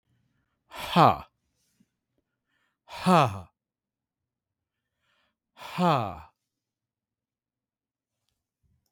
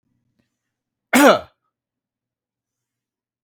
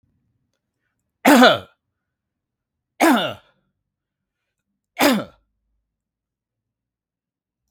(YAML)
exhalation_length: 8.9 s
exhalation_amplitude: 19295
exhalation_signal_mean_std_ratio: 0.25
cough_length: 3.4 s
cough_amplitude: 32467
cough_signal_mean_std_ratio: 0.22
three_cough_length: 7.7 s
three_cough_amplitude: 32768
three_cough_signal_mean_std_ratio: 0.25
survey_phase: beta (2021-08-13 to 2022-03-07)
age: 45-64
gender: Male
wearing_mask: 'No'
symptom_runny_or_blocked_nose: true
symptom_onset: 5 days
smoker_status: Ex-smoker
respiratory_condition_asthma: false
respiratory_condition_other: false
recruitment_source: REACT
submission_delay: 0 days
covid_test_result: Negative
covid_test_method: RT-qPCR
influenza_a_test_result: Negative
influenza_b_test_result: Negative